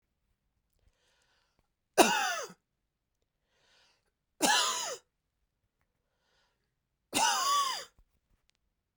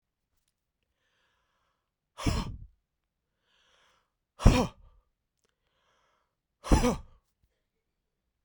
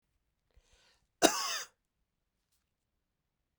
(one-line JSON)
{"three_cough_length": "9.0 s", "three_cough_amplitude": 17076, "three_cough_signal_mean_std_ratio": 0.32, "exhalation_length": "8.4 s", "exhalation_amplitude": 18236, "exhalation_signal_mean_std_ratio": 0.21, "cough_length": "3.6 s", "cough_amplitude": 15893, "cough_signal_mean_std_ratio": 0.2, "survey_phase": "beta (2021-08-13 to 2022-03-07)", "age": "45-64", "gender": "Male", "wearing_mask": "No", "symptom_headache": true, "smoker_status": "Never smoked", "respiratory_condition_asthma": true, "respiratory_condition_other": false, "recruitment_source": "REACT", "submission_delay": "1 day", "covid_test_result": "Negative", "covid_test_method": "RT-qPCR", "influenza_a_test_result": "Negative", "influenza_b_test_result": "Negative"}